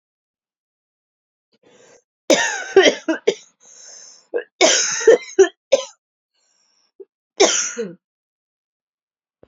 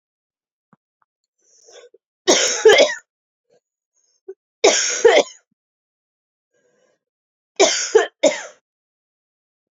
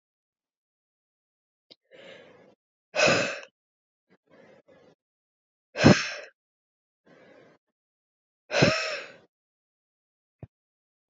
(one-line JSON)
{"cough_length": "9.5 s", "cough_amplitude": 32767, "cough_signal_mean_std_ratio": 0.32, "three_cough_length": "9.7 s", "three_cough_amplitude": 32767, "three_cough_signal_mean_std_ratio": 0.31, "exhalation_length": "11.1 s", "exhalation_amplitude": 24371, "exhalation_signal_mean_std_ratio": 0.23, "survey_phase": "alpha (2021-03-01 to 2021-08-12)", "age": "18-44", "gender": "Female", "wearing_mask": "No", "symptom_cough_any": true, "symptom_fatigue": true, "symptom_fever_high_temperature": true, "symptom_headache": true, "symptom_onset": "4 days", "smoker_status": "Ex-smoker", "respiratory_condition_asthma": false, "respiratory_condition_other": false, "recruitment_source": "Test and Trace", "submission_delay": "3 days", "covid_test_result": "Positive", "covid_test_method": "RT-qPCR"}